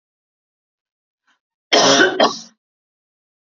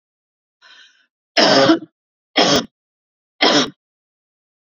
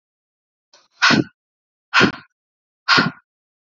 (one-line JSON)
{"cough_length": "3.6 s", "cough_amplitude": 32767, "cough_signal_mean_std_ratio": 0.32, "three_cough_length": "4.8 s", "three_cough_amplitude": 32767, "three_cough_signal_mean_std_ratio": 0.37, "exhalation_length": "3.8 s", "exhalation_amplitude": 32530, "exhalation_signal_mean_std_ratio": 0.32, "survey_phase": "beta (2021-08-13 to 2022-03-07)", "age": "18-44", "gender": "Female", "wearing_mask": "No", "symptom_runny_or_blocked_nose": true, "symptom_sore_throat": true, "symptom_headache": true, "symptom_onset": "2 days", "smoker_status": "Never smoked", "respiratory_condition_asthma": false, "respiratory_condition_other": false, "recruitment_source": "REACT", "submission_delay": "1 day", "covid_test_result": "Negative", "covid_test_method": "RT-qPCR", "influenza_a_test_result": "Negative", "influenza_b_test_result": "Negative"}